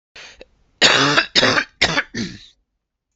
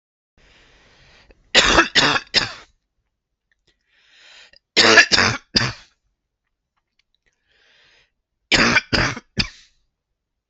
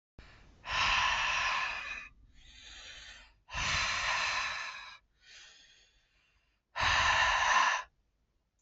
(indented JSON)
{
  "cough_length": "3.2 s",
  "cough_amplitude": 32768,
  "cough_signal_mean_std_ratio": 0.47,
  "three_cough_length": "10.5 s",
  "three_cough_amplitude": 32211,
  "three_cough_signal_mean_std_ratio": 0.33,
  "exhalation_length": "8.6 s",
  "exhalation_amplitude": 6159,
  "exhalation_signal_mean_std_ratio": 0.58,
  "survey_phase": "beta (2021-08-13 to 2022-03-07)",
  "age": "18-44",
  "gender": "Male",
  "wearing_mask": "No",
  "symptom_none": true,
  "smoker_status": "Never smoked",
  "respiratory_condition_asthma": false,
  "respiratory_condition_other": false,
  "recruitment_source": "REACT",
  "submission_delay": "1 day",
  "covid_test_result": "Negative",
  "covid_test_method": "RT-qPCR"
}